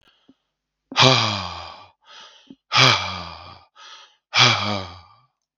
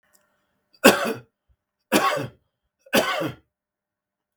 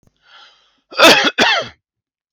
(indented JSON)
{
  "exhalation_length": "5.6 s",
  "exhalation_amplitude": 32767,
  "exhalation_signal_mean_std_ratio": 0.39,
  "three_cough_length": "4.4 s",
  "three_cough_amplitude": 32768,
  "three_cough_signal_mean_std_ratio": 0.33,
  "cough_length": "2.3 s",
  "cough_amplitude": 32768,
  "cough_signal_mean_std_ratio": 0.41,
  "survey_phase": "beta (2021-08-13 to 2022-03-07)",
  "age": "65+",
  "gender": "Male",
  "wearing_mask": "No",
  "symptom_none": true,
  "smoker_status": "Never smoked",
  "respiratory_condition_asthma": false,
  "respiratory_condition_other": false,
  "recruitment_source": "REACT",
  "submission_delay": "2 days",
  "covid_test_result": "Negative",
  "covid_test_method": "RT-qPCR",
  "influenza_a_test_result": "Unknown/Void",
  "influenza_b_test_result": "Unknown/Void"
}